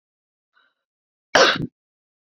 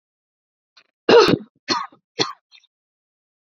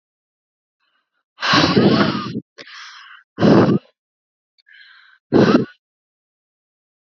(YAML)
cough_length: 2.3 s
cough_amplitude: 29499
cough_signal_mean_std_ratio: 0.25
three_cough_length: 3.6 s
three_cough_amplitude: 28166
three_cough_signal_mean_std_ratio: 0.27
exhalation_length: 7.1 s
exhalation_amplitude: 32349
exhalation_signal_mean_std_ratio: 0.39
survey_phase: beta (2021-08-13 to 2022-03-07)
age: 18-44
gender: Female
wearing_mask: 'No'
symptom_fatigue: true
symptom_headache: true
smoker_status: Never smoked
respiratory_condition_asthma: false
respiratory_condition_other: false
recruitment_source: REACT
submission_delay: 0 days
covid_test_result: Negative
covid_test_method: RT-qPCR
influenza_a_test_result: Negative
influenza_b_test_result: Negative